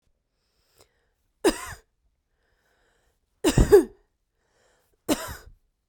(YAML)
three_cough_length: 5.9 s
three_cough_amplitude: 22948
three_cough_signal_mean_std_ratio: 0.24
survey_phase: beta (2021-08-13 to 2022-03-07)
age: 18-44
gender: Female
wearing_mask: 'No'
symptom_runny_or_blocked_nose: true
symptom_fatigue: true
symptom_fever_high_temperature: true
symptom_headache: true
symptom_other: true
symptom_onset: 5 days
smoker_status: Ex-smoker
respiratory_condition_asthma: false
respiratory_condition_other: false
recruitment_source: Test and Trace
submission_delay: 2 days
covid_test_result: Positive
covid_test_method: RT-qPCR
covid_ct_value: 26.7
covid_ct_gene: N gene